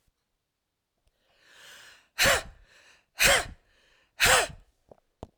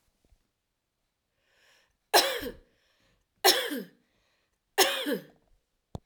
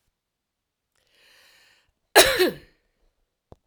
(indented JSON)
{
  "exhalation_length": "5.4 s",
  "exhalation_amplitude": 15637,
  "exhalation_signal_mean_std_ratio": 0.31,
  "three_cough_length": "6.1 s",
  "three_cough_amplitude": 19604,
  "three_cough_signal_mean_std_ratio": 0.29,
  "cough_length": "3.7 s",
  "cough_amplitude": 32767,
  "cough_signal_mean_std_ratio": 0.22,
  "survey_phase": "alpha (2021-03-01 to 2021-08-12)",
  "age": "65+",
  "gender": "Female",
  "wearing_mask": "No",
  "symptom_none": true,
  "smoker_status": "Ex-smoker",
  "respiratory_condition_asthma": false,
  "respiratory_condition_other": false,
  "recruitment_source": "REACT",
  "submission_delay": "32 days",
  "covid_test_result": "Negative",
  "covid_test_method": "RT-qPCR"
}